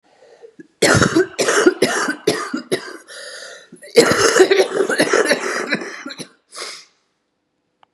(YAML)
cough_length: 7.9 s
cough_amplitude: 32768
cough_signal_mean_std_ratio: 0.53
survey_phase: beta (2021-08-13 to 2022-03-07)
age: 45-64
gender: Female
wearing_mask: 'No'
symptom_cough_any: true
symptom_new_continuous_cough: true
symptom_shortness_of_breath: true
symptom_diarrhoea: true
symptom_fatigue: true
symptom_change_to_sense_of_smell_or_taste: true
symptom_loss_of_taste: true
symptom_other: true
symptom_onset: 5 days
smoker_status: Ex-smoker
respiratory_condition_asthma: true
respiratory_condition_other: false
recruitment_source: Test and Trace
submission_delay: 1 day
covid_test_result: Positive
covid_test_method: RT-qPCR
covid_ct_value: 23.3
covid_ct_gene: N gene
covid_ct_mean: 23.7
covid_viral_load: 17000 copies/ml
covid_viral_load_category: Low viral load (10K-1M copies/ml)